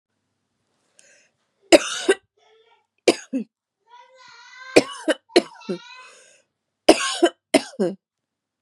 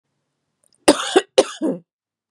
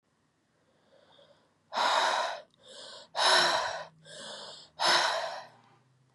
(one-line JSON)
{"three_cough_length": "8.6 s", "three_cough_amplitude": 32768, "three_cough_signal_mean_std_ratio": 0.26, "cough_length": "2.3 s", "cough_amplitude": 32768, "cough_signal_mean_std_ratio": 0.31, "exhalation_length": "6.1 s", "exhalation_amplitude": 8019, "exhalation_signal_mean_std_ratio": 0.49, "survey_phase": "beta (2021-08-13 to 2022-03-07)", "age": "18-44", "gender": "Female", "wearing_mask": "No", "symptom_runny_or_blocked_nose": true, "symptom_onset": "4 days", "smoker_status": "Never smoked", "respiratory_condition_asthma": false, "respiratory_condition_other": false, "recruitment_source": "Test and Trace", "submission_delay": "2 days", "covid_test_result": "Positive", "covid_test_method": "RT-qPCR", "covid_ct_value": 22.6, "covid_ct_gene": "S gene"}